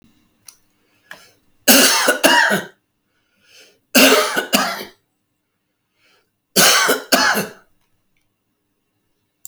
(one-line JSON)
{"three_cough_length": "9.5 s", "three_cough_amplitude": 32768, "three_cough_signal_mean_std_ratio": 0.4, "survey_phase": "alpha (2021-03-01 to 2021-08-12)", "age": "65+", "gender": "Male", "wearing_mask": "No", "symptom_none": true, "smoker_status": "Ex-smoker", "respiratory_condition_asthma": false, "respiratory_condition_other": false, "recruitment_source": "REACT", "submission_delay": "8 days", "covid_test_result": "Negative", "covid_test_method": "RT-qPCR"}